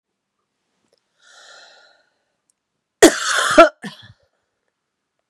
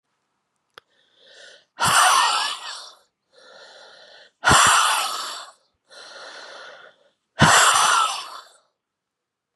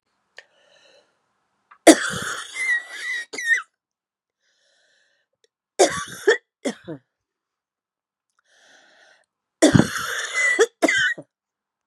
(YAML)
cough_length: 5.3 s
cough_amplitude: 32768
cough_signal_mean_std_ratio: 0.23
exhalation_length: 9.6 s
exhalation_amplitude: 28378
exhalation_signal_mean_std_ratio: 0.43
three_cough_length: 11.9 s
three_cough_amplitude: 32768
three_cough_signal_mean_std_ratio: 0.33
survey_phase: beta (2021-08-13 to 2022-03-07)
age: 45-64
gender: Female
wearing_mask: 'No'
symptom_cough_any: true
symptom_runny_or_blocked_nose: true
symptom_diarrhoea: true
symptom_fever_high_temperature: true
symptom_headache: true
symptom_change_to_sense_of_smell_or_taste: true
symptom_onset: 3 days
smoker_status: Never smoked
respiratory_condition_asthma: true
respiratory_condition_other: false
recruitment_source: Test and Trace
submission_delay: 2 days
covid_test_result: Positive
covid_test_method: RT-qPCR
covid_ct_value: 15.5
covid_ct_gene: N gene